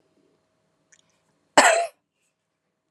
{"cough_length": "2.9 s", "cough_amplitude": 31932, "cough_signal_mean_std_ratio": 0.24, "survey_phase": "alpha (2021-03-01 to 2021-08-12)", "age": "45-64", "gender": "Female", "wearing_mask": "No", "symptom_none": true, "smoker_status": "Never smoked", "respiratory_condition_asthma": false, "respiratory_condition_other": false, "recruitment_source": "REACT", "submission_delay": "1 day", "covid_test_result": "Negative", "covid_test_method": "RT-qPCR"}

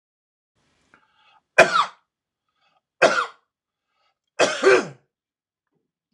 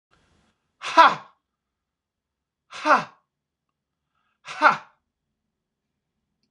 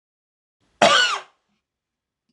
{"three_cough_length": "6.1 s", "three_cough_amplitude": 26028, "three_cough_signal_mean_std_ratio": 0.28, "exhalation_length": "6.5 s", "exhalation_amplitude": 26028, "exhalation_signal_mean_std_ratio": 0.22, "cough_length": "2.3 s", "cough_amplitude": 26028, "cough_signal_mean_std_ratio": 0.31, "survey_phase": "beta (2021-08-13 to 2022-03-07)", "age": "45-64", "gender": "Male", "wearing_mask": "No", "symptom_none": true, "smoker_status": "Never smoked", "respiratory_condition_asthma": false, "respiratory_condition_other": false, "recruitment_source": "REACT", "submission_delay": "3 days", "covid_test_result": "Negative", "covid_test_method": "RT-qPCR", "influenza_a_test_result": "Negative", "influenza_b_test_result": "Negative"}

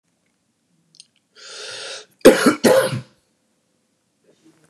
{"cough_length": "4.7 s", "cough_amplitude": 32768, "cough_signal_mean_std_ratio": 0.29, "survey_phase": "beta (2021-08-13 to 2022-03-07)", "age": "45-64", "gender": "Male", "wearing_mask": "No", "symptom_runny_or_blocked_nose": true, "symptom_sore_throat": true, "symptom_onset": "5 days", "smoker_status": "Never smoked", "respiratory_condition_asthma": false, "respiratory_condition_other": false, "recruitment_source": "REACT", "submission_delay": "2 days", "covid_test_result": "Negative", "covid_test_method": "RT-qPCR", "influenza_a_test_result": "Negative", "influenza_b_test_result": "Negative"}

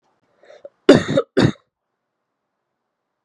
{"cough_length": "3.2 s", "cough_amplitude": 32768, "cough_signal_mean_std_ratio": 0.25, "survey_phase": "beta (2021-08-13 to 2022-03-07)", "age": "18-44", "gender": "Female", "wearing_mask": "No", "symptom_cough_any": true, "symptom_runny_or_blocked_nose": true, "symptom_sore_throat": true, "symptom_headache": true, "symptom_onset": "5 days", "smoker_status": "Never smoked", "respiratory_condition_asthma": true, "respiratory_condition_other": false, "recruitment_source": "Test and Trace", "submission_delay": "2 days", "covid_test_result": "Positive", "covid_test_method": "RT-qPCR", "covid_ct_value": 22.8, "covid_ct_gene": "S gene", "covid_ct_mean": 22.9, "covid_viral_load": "30000 copies/ml", "covid_viral_load_category": "Low viral load (10K-1M copies/ml)"}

